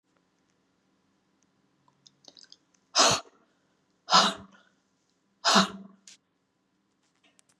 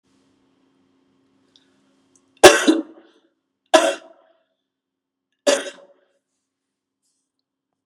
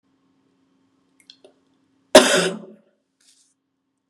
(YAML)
exhalation_length: 7.6 s
exhalation_amplitude: 15833
exhalation_signal_mean_std_ratio: 0.24
three_cough_length: 7.9 s
three_cough_amplitude: 32768
three_cough_signal_mean_std_ratio: 0.2
cough_length: 4.1 s
cough_amplitude: 32768
cough_signal_mean_std_ratio: 0.21
survey_phase: beta (2021-08-13 to 2022-03-07)
age: 65+
gender: Female
wearing_mask: 'No'
symptom_none: true
smoker_status: Ex-smoker
respiratory_condition_asthma: false
respiratory_condition_other: false
recruitment_source: REACT
submission_delay: 1 day
covid_test_result: Negative
covid_test_method: RT-qPCR
influenza_a_test_result: Negative
influenza_b_test_result: Negative